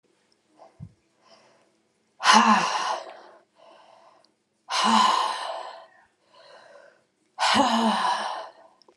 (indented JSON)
{
  "exhalation_length": "9.0 s",
  "exhalation_amplitude": 26787,
  "exhalation_signal_mean_std_ratio": 0.44,
  "survey_phase": "alpha (2021-03-01 to 2021-08-12)",
  "age": "45-64",
  "gender": "Female",
  "wearing_mask": "No",
  "symptom_none": true,
  "smoker_status": "Never smoked",
  "respiratory_condition_asthma": false,
  "respiratory_condition_other": false,
  "recruitment_source": "REACT",
  "submission_delay": "1 day",
  "covid_test_result": "Negative",
  "covid_test_method": "RT-qPCR",
  "covid_ct_value": 39.0,
  "covid_ct_gene": "N gene"
}